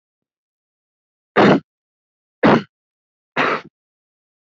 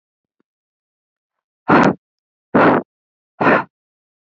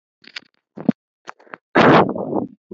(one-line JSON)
{"three_cough_length": "4.4 s", "three_cough_amplitude": 28669, "three_cough_signal_mean_std_ratio": 0.29, "exhalation_length": "4.3 s", "exhalation_amplitude": 29650, "exhalation_signal_mean_std_ratio": 0.33, "cough_length": "2.7 s", "cough_amplitude": 30665, "cough_signal_mean_std_ratio": 0.37, "survey_phase": "beta (2021-08-13 to 2022-03-07)", "age": "18-44", "gender": "Female", "wearing_mask": "No", "symptom_fever_high_temperature": true, "symptom_headache": true, "symptom_other": true, "symptom_onset": "2 days", "smoker_status": "Never smoked", "respiratory_condition_asthma": false, "respiratory_condition_other": false, "recruitment_source": "Test and Trace", "submission_delay": "1 day", "covid_test_result": "Positive", "covid_test_method": "RT-qPCR", "covid_ct_value": 23.4, "covid_ct_gene": "ORF1ab gene", "covid_ct_mean": 23.7, "covid_viral_load": "16000 copies/ml", "covid_viral_load_category": "Low viral load (10K-1M copies/ml)"}